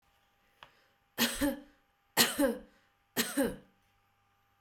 {"three_cough_length": "4.6 s", "three_cough_amplitude": 10729, "three_cough_signal_mean_std_ratio": 0.37, "survey_phase": "beta (2021-08-13 to 2022-03-07)", "age": "45-64", "gender": "Female", "wearing_mask": "No", "symptom_none": true, "smoker_status": "Never smoked", "respiratory_condition_asthma": true, "respiratory_condition_other": false, "recruitment_source": "REACT", "submission_delay": "4 days", "covid_test_result": "Negative", "covid_test_method": "RT-qPCR"}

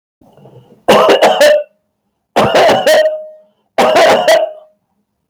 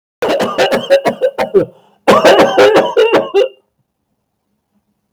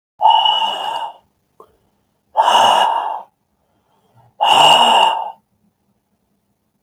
{"three_cough_length": "5.3 s", "three_cough_amplitude": 32768, "three_cough_signal_mean_std_ratio": 0.67, "cough_length": "5.1 s", "cough_amplitude": 32768, "cough_signal_mean_std_ratio": 0.63, "exhalation_length": "6.8 s", "exhalation_amplitude": 32768, "exhalation_signal_mean_std_ratio": 0.5, "survey_phase": "beta (2021-08-13 to 2022-03-07)", "age": "45-64", "gender": "Male", "wearing_mask": "No", "symptom_none": true, "smoker_status": "Ex-smoker", "respiratory_condition_asthma": false, "respiratory_condition_other": false, "recruitment_source": "REACT", "submission_delay": "3 days", "covid_test_result": "Negative", "covid_test_method": "RT-qPCR", "influenza_a_test_result": "Negative", "influenza_b_test_result": "Negative"}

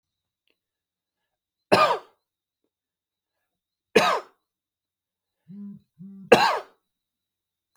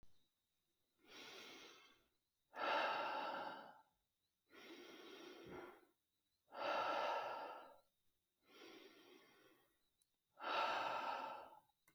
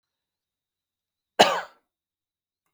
{"three_cough_length": "7.8 s", "three_cough_amplitude": 32509, "three_cough_signal_mean_std_ratio": 0.24, "exhalation_length": "11.9 s", "exhalation_amplitude": 1103, "exhalation_signal_mean_std_ratio": 0.5, "cough_length": "2.7 s", "cough_amplitude": 32766, "cough_signal_mean_std_ratio": 0.18, "survey_phase": "beta (2021-08-13 to 2022-03-07)", "age": "18-44", "gender": "Male", "wearing_mask": "No", "symptom_none": true, "smoker_status": "Never smoked", "respiratory_condition_asthma": false, "respiratory_condition_other": false, "recruitment_source": "REACT", "submission_delay": "1 day", "covid_test_result": "Negative", "covid_test_method": "RT-qPCR"}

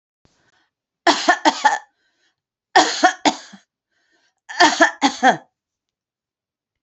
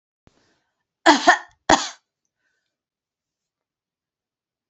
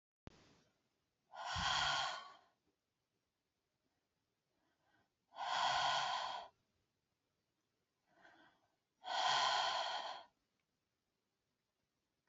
{"three_cough_length": "6.8 s", "three_cough_amplitude": 31332, "three_cough_signal_mean_std_ratio": 0.35, "cough_length": "4.7 s", "cough_amplitude": 32767, "cough_signal_mean_std_ratio": 0.21, "exhalation_length": "12.3 s", "exhalation_amplitude": 1921, "exhalation_signal_mean_std_ratio": 0.41, "survey_phase": "beta (2021-08-13 to 2022-03-07)", "age": "65+", "gender": "Female", "wearing_mask": "No", "symptom_none": true, "smoker_status": "Never smoked", "respiratory_condition_asthma": false, "respiratory_condition_other": false, "recruitment_source": "REACT", "submission_delay": "2 days", "covid_test_result": "Negative", "covid_test_method": "RT-qPCR", "influenza_a_test_result": "Negative", "influenza_b_test_result": "Negative"}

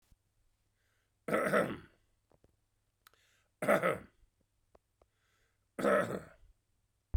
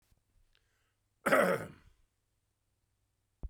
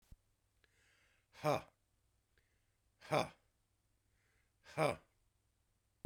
{"three_cough_length": "7.2 s", "three_cough_amplitude": 5796, "three_cough_signal_mean_std_ratio": 0.32, "cough_length": "3.5 s", "cough_amplitude": 7850, "cough_signal_mean_std_ratio": 0.26, "exhalation_length": "6.1 s", "exhalation_amplitude": 3138, "exhalation_signal_mean_std_ratio": 0.23, "survey_phase": "beta (2021-08-13 to 2022-03-07)", "age": "65+", "gender": "Male", "wearing_mask": "No", "symptom_none": true, "smoker_status": "Ex-smoker", "respiratory_condition_asthma": true, "respiratory_condition_other": false, "recruitment_source": "REACT", "submission_delay": "1 day", "covid_test_result": "Negative", "covid_test_method": "RT-qPCR"}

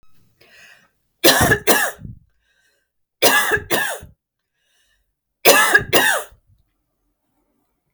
{"three_cough_length": "7.9 s", "three_cough_amplitude": 32768, "three_cough_signal_mean_std_ratio": 0.39, "survey_phase": "beta (2021-08-13 to 2022-03-07)", "age": "45-64", "gender": "Female", "wearing_mask": "No", "symptom_cough_any": true, "symptom_fatigue": true, "symptom_headache": true, "symptom_other": true, "symptom_onset": "6 days", "smoker_status": "Never smoked", "respiratory_condition_asthma": false, "respiratory_condition_other": false, "recruitment_source": "REACT", "submission_delay": "1 day", "covid_test_result": "Negative", "covid_test_method": "RT-qPCR", "influenza_a_test_result": "Negative", "influenza_b_test_result": "Negative"}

